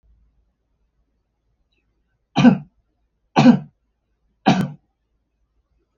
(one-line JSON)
{"three_cough_length": "6.0 s", "three_cough_amplitude": 32766, "three_cough_signal_mean_std_ratio": 0.25, "survey_phase": "beta (2021-08-13 to 2022-03-07)", "age": "65+", "gender": "Male", "wearing_mask": "No", "symptom_diarrhoea": true, "smoker_status": "Ex-smoker", "respiratory_condition_asthma": false, "respiratory_condition_other": false, "recruitment_source": "REACT", "submission_delay": "2 days", "covid_test_result": "Negative", "covid_test_method": "RT-qPCR", "influenza_a_test_result": "Negative", "influenza_b_test_result": "Negative"}